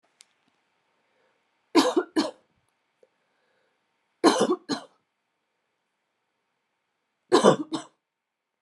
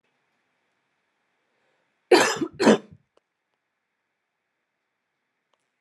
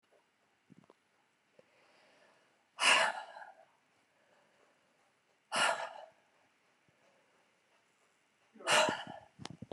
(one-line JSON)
{"three_cough_length": "8.6 s", "three_cough_amplitude": 24539, "three_cough_signal_mean_std_ratio": 0.26, "cough_length": "5.8 s", "cough_amplitude": 23894, "cough_signal_mean_std_ratio": 0.21, "exhalation_length": "9.7 s", "exhalation_amplitude": 5780, "exhalation_signal_mean_std_ratio": 0.28, "survey_phase": "beta (2021-08-13 to 2022-03-07)", "age": "18-44", "gender": "Female", "wearing_mask": "No", "symptom_cough_any": true, "symptom_runny_or_blocked_nose": true, "symptom_fatigue": true, "symptom_change_to_sense_of_smell_or_taste": true, "symptom_onset": "5 days", "smoker_status": "Never smoked", "respiratory_condition_asthma": false, "respiratory_condition_other": false, "recruitment_source": "Test and Trace", "submission_delay": "2 days", "covid_test_result": "Positive", "covid_test_method": "RT-qPCR"}